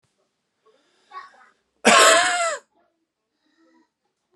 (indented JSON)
{
  "cough_length": "4.4 s",
  "cough_amplitude": 29637,
  "cough_signal_mean_std_ratio": 0.31,
  "survey_phase": "alpha (2021-03-01 to 2021-08-12)",
  "age": "18-44",
  "gender": "Male",
  "wearing_mask": "No",
  "symptom_none": true,
  "smoker_status": "Never smoked",
  "respiratory_condition_asthma": false,
  "respiratory_condition_other": false,
  "recruitment_source": "REACT",
  "submission_delay": "1 day",
  "covid_test_result": "Negative",
  "covid_test_method": "RT-qPCR"
}